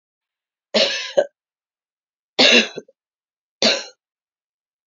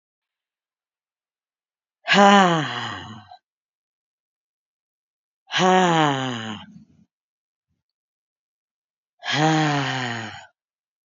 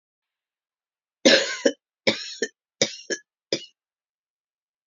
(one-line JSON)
{"three_cough_length": "4.9 s", "three_cough_amplitude": 30766, "three_cough_signal_mean_std_ratio": 0.32, "exhalation_length": "11.1 s", "exhalation_amplitude": 27760, "exhalation_signal_mean_std_ratio": 0.37, "cough_length": "4.9 s", "cough_amplitude": 27756, "cough_signal_mean_std_ratio": 0.27, "survey_phase": "beta (2021-08-13 to 2022-03-07)", "age": "18-44", "gender": "Female", "wearing_mask": "No", "symptom_cough_any": true, "symptom_sore_throat": true, "symptom_headache": true, "symptom_onset": "2 days", "smoker_status": "Never smoked", "respiratory_condition_asthma": false, "respiratory_condition_other": false, "recruitment_source": "Test and Trace", "submission_delay": "1 day", "covid_test_result": "Positive", "covid_test_method": "RT-qPCR"}